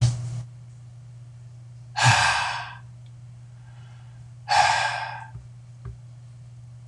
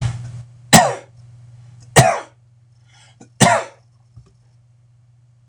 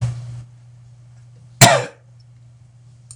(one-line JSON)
{"exhalation_length": "6.9 s", "exhalation_amplitude": 18505, "exhalation_signal_mean_std_ratio": 0.51, "three_cough_length": "5.5 s", "three_cough_amplitude": 26028, "three_cough_signal_mean_std_ratio": 0.32, "cough_length": "3.2 s", "cough_amplitude": 26028, "cough_signal_mean_std_ratio": 0.3, "survey_phase": "beta (2021-08-13 to 2022-03-07)", "age": "65+", "gender": "Male", "wearing_mask": "No", "symptom_none": true, "smoker_status": "Ex-smoker", "respiratory_condition_asthma": false, "respiratory_condition_other": false, "recruitment_source": "REACT", "submission_delay": "2 days", "covid_test_result": "Negative", "covid_test_method": "RT-qPCR", "influenza_a_test_result": "Negative", "influenza_b_test_result": "Negative"}